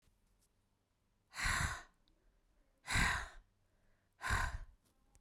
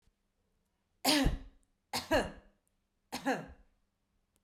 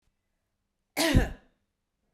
{"exhalation_length": "5.2 s", "exhalation_amplitude": 3403, "exhalation_signal_mean_std_ratio": 0.4, "three_cough_length": "4.4 s", "three_cough_amplitude": 6787, "three_cough_signal_mean_std_ratio": 0.35, "cough_length": "2.1 s", "cough_amplitude": 11001, "cough_signal_mean_std_ratio": 0.3, "survey_phase": "beta (2021-08-13 to 2022-03-07)", "age": "45-64", "gender": "Female", "wearing_mask": "No", "symptom_cough_any": true, "symptom_runny_or_blocked_nose": true, "symptom_fatigue": true, "symptom_change_to_sense_of_smell_or_taste": true, "symptom_loss_of_taste": true, "symptom_onset": "5 days", "smoker_status": "Ex-smoker", "respiratory_condition_asthma": false, "respiratory_condition_other": false, "recruitment_source": "Test and Trace", "submission_delay": "2 days", "covid_test_result": "Positive", "covid_test_method": "RT-qPCR"}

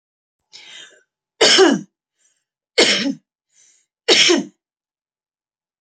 {"three_cough_length": "5.8 s", "three_cough_amplitude": 31254, "three_cough_signal_mean_std_ratio": 0.35, "survey_phase": "beta (2021-08-13 to 2022-03-07)", "age": "18-44", "gender": "Female", "wearing_mask": "No", "symptom_change_to_sense_of_smell_or_taste": true, "smoker_status": "Ex-smoker", "respiratory_condition_asthma": false, "respiratory_condition_other": false, "recruitment_source": "REACT", "submission_delay": "2 days", "covid_test_result": "Negative", "covid_test_method": "RT-qPCR"}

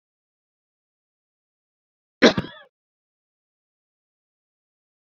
{"cough_length": "5.0 s", "cough_amplitude": 29920, "cough_signal_mean_std_ratio": 0.12, "survey_phase": "beta (2021-08-13 to 2022-03-07)", "age": "18-44", "gender": "Male", "wearing_mask": "No", "symptom_cough_any": true, "symptom_runny_or_blocked_nose": true, "symptom_fatigue": true, "symptom_fever_high_temperature": true, "symptom_headache": true, "symptom_change_to_sense_of_smell_or_taste": true, "smoker_status": "Never smoked", "respiratory_condition_asthma": true, "respiratory_condition_other": false, "recruitment_source": "Test and Trace", "submission_delay": "2 days", "covid_test_result": "Positive", "covid_test_method": "RT-qPCR", "covid_ct_value": 28.2, "covid_ct_gene": "ORF1ab gene", "covid_ct_mean": 28.7, "covid_viral_load": "400 copies/ml", "covid_viral_load_category": "Minimal viral load (< 10K copies/ml)"}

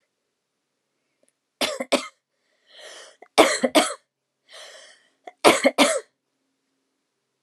{"three_cough_length": "7.4 s", "three_cough_amplitude": 29204, "three_cough_signal_mean_std_ratio": 0.28, "survey_phase": "alpha (2021-03-01 to 2021-08-12)", "age": "45-64", "gender": "Female", "wearing_mask": "No", "symptom_headache": true, "symptom_onset": "12 days", "smoker_status": "Ex-smoker", "respiratory_condition_asthma": true, "respiratory_condition_other": false, "recruitment_source": "REACT", "submission_delay": "2 days", "covid_test_result": "Negative", "covid_test_method": "RT-qPCR"}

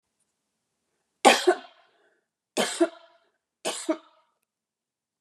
{"three_cough_length": "5.2 s", "three_cough_amplitude": 28308, "three_cough_signal_mean_std_ratio": 0.25, "survey_phase": "beta (2021-08-13 to 2022-03-07)", "age": "65+", "gender": "Female", "wearing_mask": "No", "symptom_abdominal_pain": true, "symptom_headache": true, "symptom_onset": "12 days", "smoker_status": "Ex-smoker", "respiratory_condition_asthma": false, "respiratory_condition_other": false, "recruitment_source": "REACT", "submission_delay": "8 days", "covid_test_result": "Negative", "covid_test_method": "RT-qPCR", "influenza_a_test_result": "Negative", "influenza_b_test_result": "Negative"}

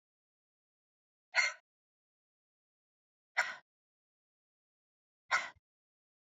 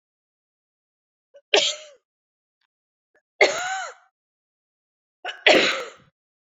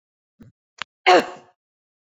{"exhalation_length": "6.4 s", "exhalation_amplitude": 5623, "exhalation_signal_mean_std_ratio": 0.19, "three_cough_length": "6.5 s", "three_cough_amplitude": 30757, "three_cough_signal_mean_std_ratio": 0.28, "cough_length": "2.0 s", "cough_amplitude": 26365, "cough_signal_mean_std_ratio": 0.24, "survey_phase": "beta (2021-08-13 to 2022-03-07)", "age": "45-64", "gender": "Female", "wearing_mask": "No", "symptom_cough_any": true, "smoker_status": "Never smoked", "respiratory_condition_asthma": false, "respiratory_condition_other": false, "recruitment_source": "REACT", "submission_delay": "2 days", "covid_test_result": "Negative", "covid_test_method": "RT-qPCR"}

